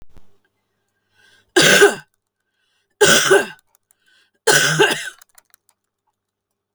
{"three_cough_length": "6.7 s", "three_cough_amplitude": 32768, "three_cough_signal_mean_std_ratio": 0.36, "survey_phase": "beta (2021-08-13 to 2022-03-07)", "age": "45-64", "gender": "Female", "wearing_mask": "No", "symptom_abdominal_pain": true, "symptom_onset": "12 days", "smoker_status": "Ex-smoker", "respiratory_condition_asthma": false, "respiratory_condition_other": true, "recruitment_source": "REACT", "submission_delay": "1 day", "covid_test_result": "Negative", "covid_test_method": "RT-qPCR"}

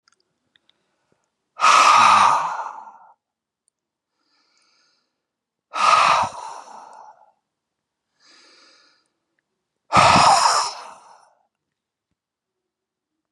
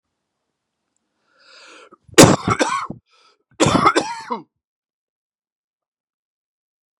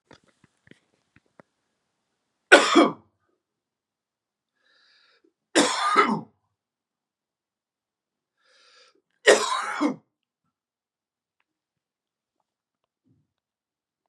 {"exhalation_length": "13.3 s", "exhalation_amplitude": 28024, "exhalation_signal_mean_std_ratio": 0.35, "cough_length": "7.0 s", "cough_amplitude": 32768, "cough_signal_mean_std_ratio": 0.27, "three_cough_length": "14.1 s", "three_cough_amplitude": 32767, "three_cough_signal_mean_std_ratio": 0.23, "survey_phase": "beta (2021-08-13 to 2022-03-07)", "age": "45-64", "gender": "Male", "wearing_mask": "No", "symptom_cough_any": true, "symptom_runny_or_blocked_nose": true, "symptom_onset": "5 days", "smoker_status": "Ex-smoker", "respiratory_condition_asthma": false, "respiratory_condition_other": false, "recruitment_source": "Test and Trace", "submission_delay": "2 days", "covid_test_result": "Positive", "covid_test_method": "RT-qPCR", "covid_ct_value": 15.4, "covid_ct_gene": "ORF1ab gene", "covid_ct_mean": 15.7, "covid_viral_load": "7000000 copies/ml", "covid_viral_load_category": "High viral load (>1M copies/ml)"}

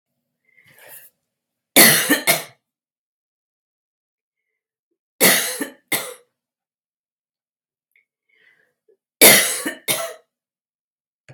{"three_cough_length": "11.3 s", "three_cough_amplitude": 32768, "three_cough_signal_mean_std_ratio": 0.27, "survey_phase": "beta (2021-08-13 to 2022-03-07)", "age": "65+", "gender": "Female", "wearing_mask": "No", "symptom_fatigue": true, "symptom_headache": true, "symptom_onset": "5 days", "smoker_status": "Ex-smoker", "respiratory_condition_asthma": false, "respiratory_condition_other": false, "recruitment_source": "Test and Trace", "submission_delay": "2 days", "covid_test_result": "Positive", "covid_test_method": "RT-qPCR", "covid_ct_value": 19.5, "covid_ct_gene": "N gene", "covid_ct_mean": 20.3, "covid_viral_load": "220000 copies/ml", "covid_viral_load_category": "Low viral load (10K-1M copies/ml)"}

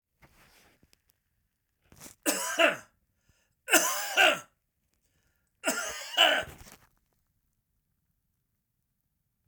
{"three_cough_length": "9.5 s", "three_cough_amplitude": 16566, "three_cough_signal_mean_std_ratio": 0.31, "survey_phase": "beta (2021-08-13 to 2022-03-07)", "age": "65+", "gender": "Male", "wearing_mask": "No", "symptom_none": true, "smoker_status": "Never smoked", "respiratory_condition_asthma": false, "respiratory_condition_other": false, "recruitment_source": "REACT", "submission_delay": "3 days", "covid_test_result": "Negative", "covid_test_method": "RT-qPCR", "influenza_a_test_result": "Negative", "influenza_b_test_result": "Negative"}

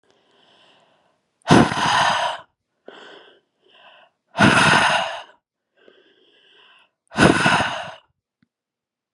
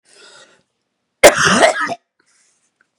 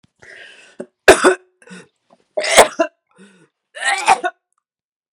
{"exhalation_length": "9.1 s", "exhalation_amplitude": 32768, "exhalation_signal_mean_std_ratio": 0.39, "cough_length": "3.0 s", "cough_amplitude": 32768, "cough_signal_mean_std_ratio": 0.34, "three_cough_length": "5.1 s", "three_cough_amplitude": 32768, "three_cough_signal_mean_std_ratio": 0.32, "survey_phase": "beta (2021-08-13 to 2022-03-07)", "age": "18-44", "gender": "Female", "wearing_mask": "No", "symptom_cough_any": true, "smoker_status": "Never smoked", "respiratory_condition_asthma": false, "respiratory_condition_other": false, "recruitment_source": "Test and Trace", "submission_delay": "2 days", "covid_test_result": "Positive", "covid_test_method": "RT-qPCR"}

